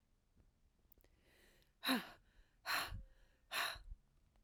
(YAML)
exhalation_length: 4.4 s
exhalation_amplitude: 2310
exhalation_signal_mean_std_ratio: 0.38
survey_phase: beta (2021-08-13 to 2022-03-07)
age: 45-64
gender: Female
wearing_mask: 'No'
symptom_cough_any: true
symptom_runny_or_blocked_nose: true
symptom_onset: 3 days
smoker_status: Never smoked
respiratory_condition_asthma: true
respiratory_condition_other: false
recruitment_source: Test and Trace
submission_delay: 2 days
covid_test_result: Positive
covid_test_method: RT-qPCR